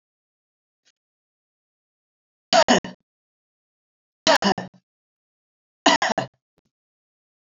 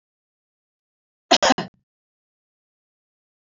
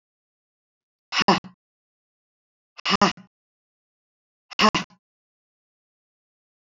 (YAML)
three_cough_length: 7.4 s
three_cough_amplitude: 25852
three_cough_signal_mean_std_ratio: 0.24
cough_length: 3.6 s
cough_amplitude: 26896
cough_signal_mean_std_ratio: 0.18
exhalation_length: 6.7 s
exhalation_amplitude: 21761
exhalation_signal_mean_std_ratio: 0.22
survey_phase: beta (2021-08-13 to 2022-03-07)
age: 65+
gender: Female
wearing_mask: 'No'
symptom_none: true
smoker_status: Ex-smoker
respiratory_condition_asthma: false
respiratory_condition_other: false
recruitment_source: REACT
submission_delay: 6 days
covid_test_result: Negative
covid_test_method: RT-qPCR
influenza_a_test_result: Negative
influenza_b_test_result: Negative